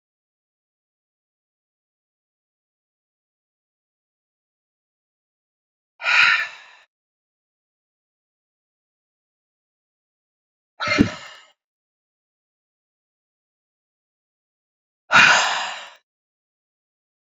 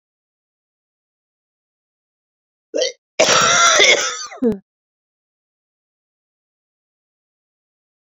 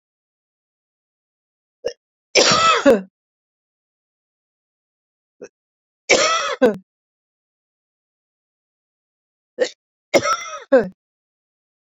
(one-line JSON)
{"exhalation_length": "17.2 s", "exhalation_amplitude": 32767, "exhalation_signal_mean_std_ratio": 0.2, "cough_length": "8.2 s", "cough_amplitude": 32768, "cough_signal_mean_std_ratio": 0.31, "three_cough_length": "11.9 s", "three_cough_amplitude": 30035, "three_cough_signal_mean_std_ratio": 0.29, "survey_phase": "beta (2021-08-13 to 2022-03-07)", "age": "65+", "gender": "Female", "wearing_mask": "No", "symptom_none": true, "smoker_status": "Ex-smoker", "respiratory_condition_asthma": false, "respiratory_condition_other": false, "recruitment_source": "REACT", "submission_delay": "3 days", "covid_test_result": "Negative", "covid_test_method": "RT-qPCR"}